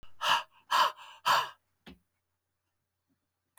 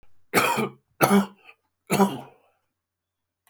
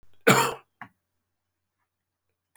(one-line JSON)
{"exhalation_length": "3.6 s", "exhalation_amplitude": 9059, "exhalation_signal_mean_std_ratio": 0.35, "three_cough_length": "3.5 s", "three_cough_amplitude": 23050, "three_cough_signal_mean_std_ratio": 0.39, "cough_length": "2.6 s", "cough_amplitude": 21161, "cough_signal_mean_std_ratio": 0.24, "survey_phase": "beta (2021-08-13 to 2022-03-07)", "age": "65+", "gender": "Male", "wearing_mask": "No", "symptom_cough_any": true, "symptom_runny_or_blocked_nose": true, "symptom_fatigue": true, "smoker_status": "Ex-smoker", "respiratory_condition_asthma": false, "respiratory_condition_other": true, "recruitment_source": "Test and Trace", "submission_delay": "2 days", "covid_test_result": "Positive", "covid_test_method": "RT-qPCR", "covid_ct_value": 19.9, "covid_ct_gene": "ORF1ab gene"}